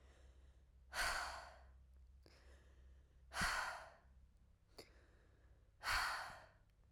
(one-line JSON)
{"exhalation_length": "6.9 s", "exhalation_amplitude": 1454, "exhalation_signal_mean_std_ratio": 0.47, "survey_phase": "alpha (2021-03-01 to 2021-08-12)", "age": "18-44", "gender": "Female", "wearing_mask": "No", "symptom_cough_any": true, "symptom_fatigue": true, "symptom_fever_high_temperature": true, "symptom_headache": true, "smoker_status": "Never smoked", "respiratory_condition_asthma": false, "respiratory_condition_other": false, "recruitment_source": "Test and Trace", "submission_delay": "2 days", "covid_test_result": "Positive", "covid_test_method": "LFT"}